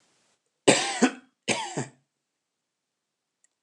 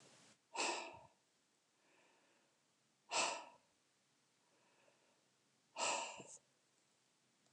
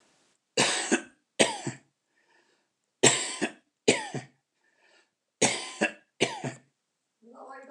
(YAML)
cough_length: 3.6 s
cough_amplitude: 22251
cough_signal_mean_std_ratio: 0.29
exhalation_length: 7.5 s
exhalation_amplitude: 1922
exhalation_signal_mean_std_ratio: 0.33
three_cough_length: 7.7 s
three_cough_amplitude: 21182
three_cough_signal_mean_std_ratio: 0.35
survey_phase: beta (2021-08-13 to 2022-03-07)
age: 65+
gender: Male
wearing_mask: 'No'
symptom_none: true
smoker_status: Never smoked
respiratory_condition_asthma: false
respiratory_condition_other: false
recruitment_source: REACT
submission_delay: 0 days
covid_test_result: Negative
covid_test_method: RT-qPCR
influenza_a_test_result: Negative
influenza_b_test_result: Negative